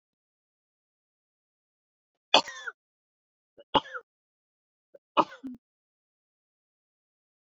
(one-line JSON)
{"three_cough_length": "7.6 s", "three_cough_amplitude": 22975, "three_cough_signal_mean_std_ratio": 0.14, "survey_phase": "beta (2021-08-13 to 2022-03-07)", "age": "45-64", "gender": "Female", "wearing_mask": "No", "symptom_cough_any": true, "smoker_status": "Ex-smoker", "respiratory_condition_asthma": false, "respiratory_condition_other": false, "recruitment_source": "REACT", "submission_delay": "1 day", "covid_test_result": "Negative", "covid_test_method": "RT-qPCR"}